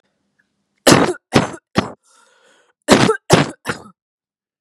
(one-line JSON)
{"three_cough_length": "4.6 s", "three_cough_amplitude": 32768, "three_cough_signal_mean_std_ratio": 0.35, "survey_phase": "beta (2021-08-13 to 2022-03-07)", "age": "18-44", "gender": "Female", "wearing_mask": "No", "symptom_cough_any": true, "symptom_runny_or_blocked_nose": true, "symptom_fatigue": true, "symptom_fever_high_temperature": true, "symptom_headache": true, "symptom_other": true, "symptom_onset": "4 days", "smoker_status": "Never smoked", "respiratory_condition_asthma": true, "respiratory_condition_other": false, "recruitment_source": "Test and Trace", "submission_delay": "2 days", "covid_test_result": "Positive", "covid_test_method": "RT-qPCR", "covid_ct_value": 21.2, "covid_ct_gene": "ORF1ab gene"}